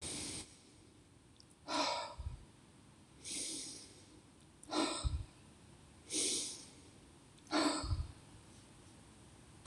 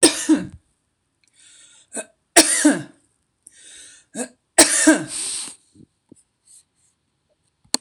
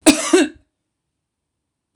{"exhalation_length": "9.7 s", "exhalation_amplitude": 2857, "exhalation_signal_mean_std_ratio": 0.53, "three_cough_length": "7.8 s", "three_cough_amplitude": 26028, "three_cough_signal_mean_std_ratio": 0.32, "cough_length": "2.0 s", "cough_amplitude": 26028, "cough_signal_mean_std_ratio": 0.32, "survey_phase": "beta (2021-08-13 to 2022-03-07)", "age": "65+", "gender": "Female", "wearing_mask": "No", "symptom_none": true, "smoker_status": "Never smoked", "respiratory_condition_asthma": false, "respiratory_condition_other": false, "recruitment_source": "REACT", "submission_delay": "1 day", "covid_test_result": "Negative", "covid_test_method": "RT-qPCR", "influenza_a_test_result": "Negative", "influenza_b_test_result": "Negative"}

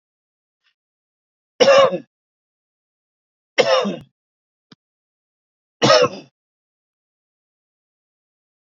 {"three_cough_length": "8.7 s", "three_cough_amplitude": 29213, "three_cough_signal_mean_std_ratio": 0.26, "survey_phase": "beta (2021-08-13 to 2022-03-07)", "age": "45-64", "gender": "Male", "wearing_mask": "No", "symptom_cough_any": true, "symptom_new_continuous_cough": true, "symptom_runny_or_blocked_nose": true, "symptom_headache": true, "symptom_onset": "3 days", "smoker_status": "Never smoked", "respiratory_condition_asthma": true, "respiratory_condition_other": false, "recruitment_source": "Test and Trace", "submission_delay": "1 day", "covid_test_result": "Positive", "covid_test_method": "RT-qPCR", "covid_ct_value": 25.0, "covid_ct_gene": "ORF1ab gene", "covid_ct_mean": 25.3, "covid_viral_load": "5100 copies/ml", "covid_viral_load_category": "Minimal viral load (< 10K copies/ml)"}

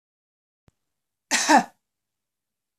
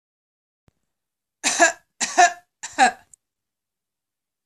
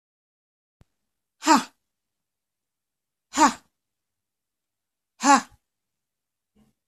{"cough_length": "2.8 s", "cough_amplitude": 18965, "cough_signal_mean_std_ratio": 0.24, "three_cough_length": "4.5 s", "three_cough_amplitude": 25275, "three_cough_signal_mean_std_ratio": 0.28, "exhalation_length": "6.9 s", "exhalation_amplitude": 23751, "exhalation_signal_mean_std_ratio": 0.21, "survey_phase": "beta (2021-08-13 to 2022-03-07)", "age": "45-64", "gender": "Female", "wearing_mask": "No", "symptom_runny_or_blocked_nose": true, "smoker_status": "Never smoked", "respiratory_condition_asthma": false, "respiratory_condition_other": false, "recruitment_source": "REACT", "submission_delay": "3 days", "covid_test_result": "Negative", "covid_test_method": "RT-qPCR", "influenza_a_test_result": "Negative", "influenza_b_test_result": "Negative"}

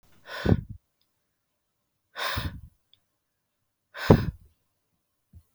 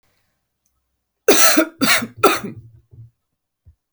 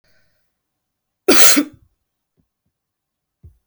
{"exhalation_length": "5.5 s", "exhalation_amplitude": 25252, "exhalation_signal_mean_std_ratio": 0.24, "three_cough_length": "3.9 s", "three_cough_amplitude": 32768, "three_cough_signal_mean_std_ratio": 0.36, "cough_length": "3.7 s", "cough_amplitude": 32768, "cough_signal_mean_std_ratio": 0.25, "survey_phase": "beta (2021-08-13 to 2022-03-07)", "age": "18-44", "gender": "Female", "wearing_mask": "No", "symptom_none": true, "smoker_status": "Never smoked", "respiratory_condition_asthma": false, "respiratory_condition_other": false, "recruitment_source": "Test and Trace", "submission_delay": "-1 day", "covid_test_result": "Negative", "covid_test_method": "LFT"}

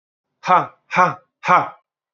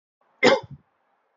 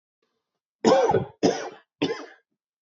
{"exhalation_length": "2.1 s", "exhalation_amplitude": 27851, "exhalation_signal_mean_std_ratio": 0.39, "cough_length": "1.4 s", "cough_amplitude": 27200, "cough_signal_mean_std_ratio": 0.29, "three_cough_length": "2.8 s", "three_cough_amplitude": 20684, "three_cough_signal_mean_std_ratio": 0.41, "survey_phase": "beta (2021-08-13 to 2022-03-07)", "age": "18-44", "gender": "Male", "wearing_mask": "No", "symptom_cough_any": true, "symptom_runny_or_blocked_nose": true, "symptom_sore_throat": true, "symptom_fatigue": true, "symptom_fever_high_temperature": true, "symptom_headache": true, "symptom_other": true, "symptom_onset": "4 days", "smoker_status": "Never smoked", "respiratory_condition_asthma": false, "respiratory_condition_other": false, "recruitment_source": "Test and Trace", "submission_delay": "1 day", "covid_test_result": "Positive", "covid_test_method": "RT-qPCR", "covid_ct_value": 16.7, "covid_ct_gene": "ORF1ab gene", "covid_ct_mean": 17.8, "covid_viral_load": "1500000 copies/ml", "covid_viral_load_category": "High viral load (>1M copies/ml)"}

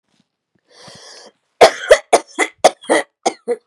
{"cough_length": "3.7 s", "cough_amplitude": 32768, "cough_signal_mean_std_ratio": 0.32, "survey_phase": "beta (2021-08-13 to 2022-03-07)", "age": "45-64", "gender": "Female", "wearing_mask": "No", "symptom_runny_or_blocked_nose": true, "symptom_onset": "12 days", "smoker_status": "Never smoked", "respiratory_condition_asthma": false, "respiratory_condition_other": false, "recruitment_source": "REACT", "submission_delay": "1 day", "covid_test_result": "Negative", "covid_test_method": "RT-qPCR", "influenza_a_test_result": "Negative", "influenza_b_test_result": "Negative"}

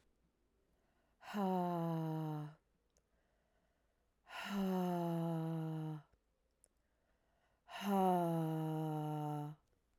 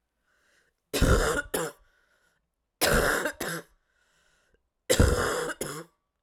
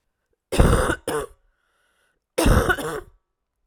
{"exhalation_length": "10.0 s", "exhalation_amplitude": 2080, "exhalation_signal_mean_std_ratio": 0.61, "three_cough_length": "6.2 s", "three_cough_amplitude": 13265, "three_cough_signal_mean_std_ratio": 0.45, "cough_length": "3.7 s", "cough_amplitude": 26261, "cough_signal_mean_std_ratio": 0.43, "survey_phase": "beta (2021-08-13 to 2022-03-07)", "age": "18-44", "gender": "Female", "wearing_mask": "No", "symptom_cough_any": true, "symptom_runny_or_blocked_nose": true, "symptom_sore_throat": true, "symptom_headache": true, "symptom_other": true, "symptom_onset": "3 days", "smoker_status": "Current smoker (e-cigarettes or vapes only)", "respiratory_condition_asthma": false, "respiratory_condition_other": false, "recruitment_source": "Test and Trace", "submission_delay": "1 day", "covid_test_result": "Positive", "covid_test_method": "RT-qPCR"}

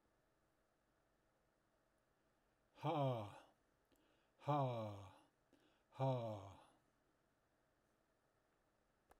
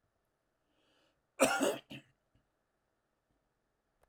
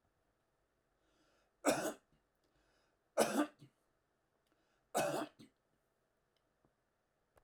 {"exhalation_length": "9.2 s", "exhalation_amplitude": 1308, "exhalation_signal_mean_std_ratio": 0.34, "cough_length": "4.1 s", "cough_amplitude": 7259, "cough_signal_mean_std_ratio": 0.24, "three_cough_length": "7.4 s", "three_cough_amplitude": 3937, "three_cough_signal_mean_std_ratio": 0.27, "survey_phase": "alpha (2021-03-01 to 2021-08-12)", "age": "65+", "gender": "Male", "wearing_mask": "No", "symptom_none": true, "smoker_status": "Ex-smoker", "respiratory_condition_asthma": false, "respiratory_condition_other": false, "recruitment_source": "REACT", "submission_delay": "1 day", "covid_test_result": "Negative", "covid_test_method": "RT-qPCR"}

